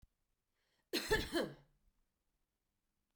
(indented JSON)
{
  "cough_length": "3.2 s",
  "cough_amplitude": 2558,
  "cough_signal_mean_std_ratio": 0.31,
  "survey_phase": "beta (2021-08-13 to 2022-03-07)",
  "age": "18-44",
  "gender": "Female",
  "wearing_mask": "No",
  "symptom_shortness_of_breath": true,
  "symptom_fatigue": true,
  "smoker_status": "Ex-smoker",
  "respiratory_condition_asthma": false,
  "respiratory_condition_other": false,
  "recruitment_source": "Test and Trace",
  "submission_delay": "2 days",
  "covid_test_result": "Positive",
  "covid_test_method": "LFT"
}